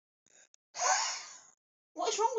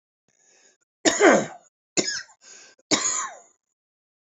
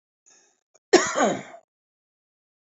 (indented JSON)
{
  "exhalation_length": "2.4 s",
  "exhalation_amplitude": 5504,
  "exhalation_signal_mean_std_ratio": 0.5,
  "three_cough_length": "4.4 s",
  "three_cough_amplitude": 26057,
  "three_cough_signal_mean_std_ratio": 0.34,
  "cough_length": "2.6 s",
  "cough_amplitude": 26462,
  "cough_signal_mean_std_ratio": 0.28,
  "survey_phase": "beta (2021-08-13 to 2022-03-07)",
  "age": "45-64",
  "gender": "Male",
  "wearing_mask": "No",
  "symptom_none": true,
  "smoker_status": "Current smoker (e-cigarettes or vapes only)",
  "respiratory_condition_asthma": false,
  "respiratory_condition_other": true,
  "recruitment_source": "REACT",
  "submission_delay": "2 days",
  "covid_test_result": "Negative",
  "covid_test_method": "RT-qPCR"
}